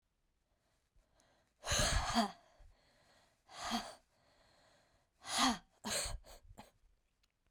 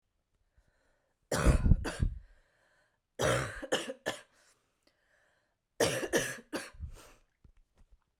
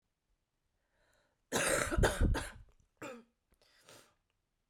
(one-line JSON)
{"exhalation_length": "7.5 s", "exhalation_amplitude": 3799, "exhalation_signal_mean_std_ratio": 0.37, "three_cough_length": "8.2 s", "three_cough_amplitude": 11876, "three_cough_signal_mean_std_ratio": 0.36, "cough_length": "4.7 s", "cough_amplitude": 4773, "cough_signal_mean_std_ratio": 0.37, "survey_phase": "beta (2021-08-13 to 2022-03-07)", "age": "18-44", "gender": "Female", "wearing_mask": "No", "symptom_cough_any": true, "symptom_new_continuous_cough": true, "symptom_runny_or_blocked_nose": true, "symptom_shortness_of_breath": true, "symptom_sore_throat": true, "symptom_fatigue": true, "symptom_onset": "4 days", "smoker_status": "Never smoked", "respiratory_condition_asthma": true, "respiratory_condition_other": false, "recruitment_source": "Test and Trace", "submission_delay": "2 days", "covid_test_result": "Positive", "covid_test_method": "RT-qPCR", "covid_ct_value": 17.5, "covid_ct_gene": "N gene", "covid_ct_mean": 17.6, "covid_viral_load": "1700000 copies/ml", "covid_viral_load_category": "High viral load (>1M copies/ml)"}